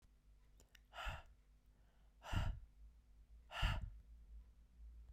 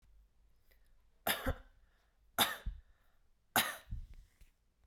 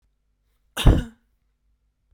{"exhalation_length": "5.1 s", "exhalation_amplitude": 1612, "exhalation_signal_mean_std_ratio": 0.45, "three_cough_length": "4.9 s", "three_cough_amplitude": 7217, "three_cough_signal_mean_std_ratio": 0.33, "cough_length": "2.1 s", "cough_amplitude": 30288, "cough_signal_mean_std_ratio": 0.23, "survey_phase": "beta (2021-08-13 to 2022-03-07)", "age": "18-44", "gender": "Female", "wearing_mask": "No", "symptom_fatigue": true, "symptom_change_to_sense_of_smell_or_taste": true, "symptom_loss_of_taste": true, "symptom_onset": "3 days", "smoker_status": "Never smoked", "respiratory_condition_asthma": false, "respiratory_condition_other": false, "recruitment_source": "Test and Trace", "submission_delay": "2 days", "covid_test_result": "Positive", "covid_test_method": "RT-qPCR", "covid_ct_value": 17.6, "covid_ct_gene": "N gene", "covid_ct_mean": 18.3, "covid_viral_load": "980000 copies/ml", "covid_viral_load_category": "Low viral load (10K-1M copies/ml)"}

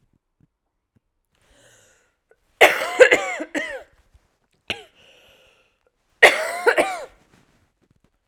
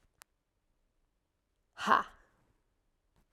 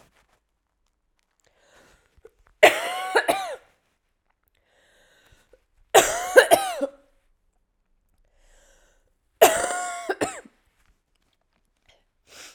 {"cough_length": "8.3 s", "cough_amplitude": 32768, "cough_signal_mean_std_ratio": 0.27, "exhalation_length": "3.3 s", "exhalation_amplitude": 9230, "exhalation_signal_mean_std_ratio": 0.18, "three_cough_length": "12.5 s", "three_cough_amplitude": 32768, "three_cough_signal_mean_std_ratio": 0.26, "survey_phase": "alpha (2021-03-01 to 2021-08-12)", "age": "18-44", "gender": "Female", "wearing_mask": "No", "symptom_cough_any": true, "symptom_headache": true, "symptom_loss_of_taste": true, "symptom_onset": "2 days", "smoker_status": "Never smoked", "respiratory_condition_asthma": false, "respiratory_condition_other": false, "recruitment_source": "Test and Trace", "submission_delay": "1 day", "covid_test_result": "Positive", "covid_test_method": "RT-qPCR"}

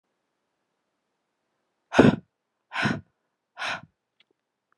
{"exhalation_length": "4.8 s", "exhalation_amplitude": 28460, "exhalation_signal_mean_std_ratio": 0.22, "survey_phase": "alpha (2021-03-01 to 2021-08-12)", "age": "18-44", "gender": "Female", "wearing_mask": "No", "symptom_cough_any": true, "symptom_shortness_of_breath": true, "symptom_diarrhoea": true, "symptom_fatigue": true, "symptom_fever_high_temperature": true, "symptom_headache": true, "symptom_change_to_sense_of_smell_or_taste": true, "symptom_onset": "3 days", "smoker_status": "Ex-smoker", "respiratory_condition_asthma": false, "respiratory_condition_other": false, "recruitment_source": "Test and Trace", "submission_delay": "2 days", "covid_test_result": "Positive", "covid_test_method": "ePCR"}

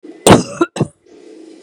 {"cough_length": "1.6 s", "cough_amplitude": 32768, "cough_signal_mean_std_ratio": 0.37, "survey_phase": "beta (2021-08-13 to 2022-03-07)", "age": "45-64", "gender": "Female", "wearing_mask": "Yes", "symptom_cough_any": true, "smoker_status": "Prefer not to say", "respiratory_condition_asthma": false, "respiratory_condition_other": false, "recruitment_source": "REACT", "submission_delay": "2 days", "covid_test_result": "Negative", "covid_test_method": "RT-qPCR", "influenza_a_test_result": "Negative", "influenza_b_test_result": "Negative"}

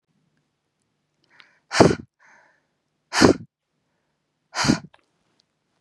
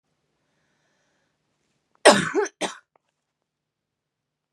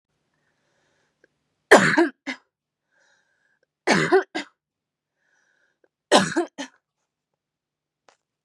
{"exhalation_length": "5.8 s", "exhalation_amplitude": 32768, "exhalation_signal_mean_std_ratio": 0.23, "cough_length": "4.5 s", "cough_amplitude": 32068, "cough_signal_mean_std_ratio": 0.2, "three_cough_length": "8.4 s", "three_cough_amplitude": 32767, "three_cough_signal_mean_std_ratio": 0.26, "survey_phase": "beta (2021-08-13 to 2022-03-07)", "age": "18-44", "gender": "Female", "wearing_mask": "No", "symptom_none": true, "smoker_status": "Never smoked", "respiratory_condition_asthma": false, "respiratory_condition_other": false, "recruitment_source": "REACT", "submission_delay": "3 days", "covid_test_result": "Negative", "covid_test_method": "RT-qPCR"}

